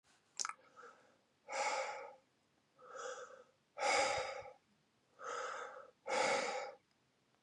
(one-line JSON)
{"exhalation_length": "7.4 s", "exhalation_amplitude": 4195, "exhalation_signal_mean_std_ratio": 0.5, "survey_phase": "beta (2021-08-13 to 2022-03-07)", "age": "18-44", "gender": "Male", "wearing_mask": "No", "symptom_runny_or_blocked_nose": true, "symptom_headache": true, "smoker_status": "Never smoked", "respiratory_condition_asthma": false, "respiratory_condition_other": false, "recruitment_source": "Test and Trace", "submission_delay": "2 days", "covid_test_result": "Positive", "covid_test_method": "RT-qPCR", "covid_ct_value": 21.9, "covid_ct_gene": "N gene"}